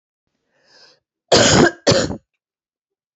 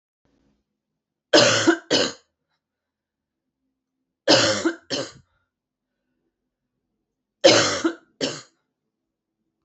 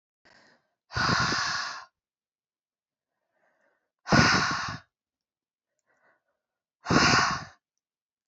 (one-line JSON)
{"cough_length": "3.2 s", "cough_amplitude": 31627, "cough_signal_mean_std_ratio": 0.36, "three_cough_length": "9.6 s", "three_cough_amplitude": 28730, "three_cough_signal_mean_std_ratio": 0.31, "exhalation_length": "8.3 s", "exhalation_amplitude": 16158, "exhalation_signal_mean_std_ratio": 0.37, "survey_phase": "beta (2021-08-13 to 2022-03-07)", "age": "18-44", "gender": "Female", "wearing_mask": "No", "symptom_cough_any": true, "symptom_runny_or_blocked_nose": true, "symptom_fatigue": true, "symptom_headache": true, "smoker_status": "Never smoked", "respiratory_condition_asthma": false, "respiratory_condition_other": false, "recruitment_source": "Test and Trace", "submission_delay": "1 day", "covid_test_result": "Positive", "covid_test_method": "RT-qPCR", "covid_ct_value": 19.2, "covid_ct_gene": "N gene"}